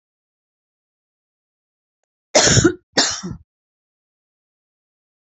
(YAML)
cough_length: 5.2 s
cough_amplitude: 30968
cough_signal_mean_std_ratio: 0.26
survey_phase: beta (2021-08-13 to 2022-03-07)
age: 65+
gender: Female
wearing_mask: 'No'
symptom_none: true
smoker_status: Never smoked
respiratory_condition_asthma: true
respiratory_condition_other: false
recruitment_source: REACT
submission_delay: 9 days
covid_test_result: Negative
covid_test_method: RT-qPCR
influenza_a_test_result: Negative
influenza_b_test_result: Negative